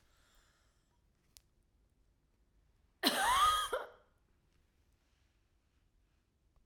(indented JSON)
{
  "cough_length": "6.7 s",
  "cough_amplitude": 7099,
  "cough_signal_mean_std_ratio": 0.29,
  "survey_phase": "beta (2021-08-13 to 2022-03-07)",
  "age": "45-64",
  "gender": "Female",
  "wearing_mask": "No",
  "symptom_cough_any": true,
  "symptom_runny_or_blocked_nose": true,
  "symptom_onset": "13 days",
  "smoker_status": "Never smoked",
  "respiratory_condition_asthma": true,
  "respiratory_condition_other": false,
  "recruitment_source": "REACT",
  "submission_delay": "1 day",
  "covid_test_result": "Negative",
  "covid_test_method": "RT-qPCR",
  "influenza_a_test_result": "Unknown/Void",
  "influenza_b_test_result": "Unknown/Void"
}